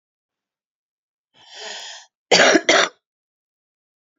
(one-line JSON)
{"cough_length": "4.2 s", "cough_amplitude": 28927, "cough_signal_mean_std_ratio": 0.29, "survey_phase": "beta (2021-08-13 to 2022-03-07)", "age": "45-64", "gender": "Female", "wearing_mask": "No", "symptom_fatigue": true, "symptom_headache": true, "symptom_change_to_sense_of_smell_or_taste": true, "smoker_status": "Never smoked", "respiratory_condition_asthma": false, "respiratory_condition_other": false, "recruitment_source": "REACT", "submission_delay": "1 day", "covid_test_result": "Negative", "covid_test_method": "RT-qPCR", "influenza_a_test_result": "Negative", "influenza_b_test_result": "Negative"}